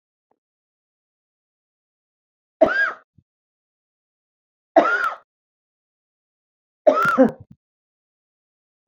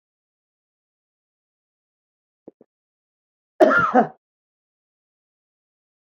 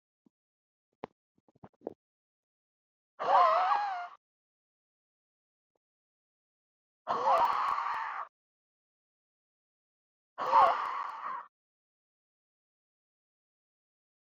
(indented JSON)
{
  "three_cough_length": "8.9 s",
  "three_cough_amplitude": 27158,
  "three_cough_signal_mean_std_ratio": 0.26,
  "cough_length": "6.1 s",
  "cough_amplitude": 25851,
  "cough_signal_mean_std_ratio": 0.2,
  "exhalation_length": "14.3 s",
  "exhalation_amplitude": 8253,
  "exhalation_signal_mean_std_ratio": 0.33,
  "survey_phase": "beta (2021-08-13 to 2022-03-07)",
  "age": "45-64",
  "gender": "Female",
  "wearing_mask": "No",
  "symptom_shortness_of_breath": true,
  "symptom_onset": "12 days",
  "smoker_status": "Ex-smoker",
  "respiratory_condition_asthma": false,
  "respiratory_condition_other": true,
  "recruitment_source": "REACT",
  "submission_delay": "1 day",
  "covid_test_result": "Negative",
  "covid_test_method": "RT-qPCR"
}